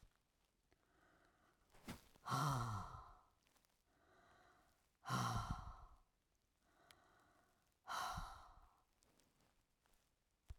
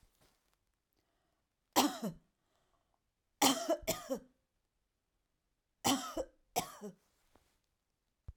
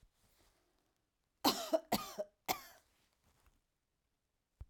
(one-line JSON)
{"exhalation_length": "10.6 s", "exhalation_amplitude": 1179, "exhalation_signal_mean_std_ratio": 0.38, "three_cough_length": "8.4 s", "three_cough_amplitude": 6091, "three_cough_signal_mean_std_ratio": 0.29, "cough_length": "4.7 s", "cough_amplitude": 4255, "cough_signal_mean_std_ratio": 0.26, "survey_phase": "alpha (2021-03-01 to 2021-08-12)", "age": "65+", "gender": "Female", "wearing_mask": "No", "symptom_none": true, "smoker_status": "Never smoked", "respiratory_condition_asthma": false, "respiratory_condition_other": false, "recruitment_source": "REACT", "submission_delay": "2 days", "covid_test_result": "Negative", "covid_test_method": "RT-qPCR"}